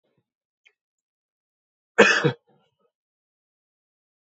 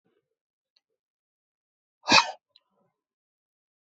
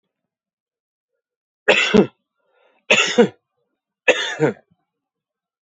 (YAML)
cough_length: 4.3 s
cough_amplitude: 28025
cough_signal_mean_std_ratio: 0.2
exhalation_length: 3.8 s
exhalation_amplitude: 23858
exhalation_signal_mean_std_ratio: 0.16
three_cough_length: 5.6 s
three_cough_amplitude: 28810
three_cough_signal_mean_std_ratio: 0.31
survey_phase: beta (2021-08-13 to 2022-03-07)
age: 45-64
gender: Male
wearing_mask: 'No'
symptom_cough_any: true
symptom_runny_or_blocked_nose: true
symptom_onset: 12 days
smoker_status: Never smoked
respiratory_condition_asthma: false
respiratory_condition_other: false
recruitment_source: REACT
submission_delay: 2 days
covid_test_result: Negative
covid_test_method: RT-qPCR
influenza_a_test_result: Negative
influenza_b_test_result: Negative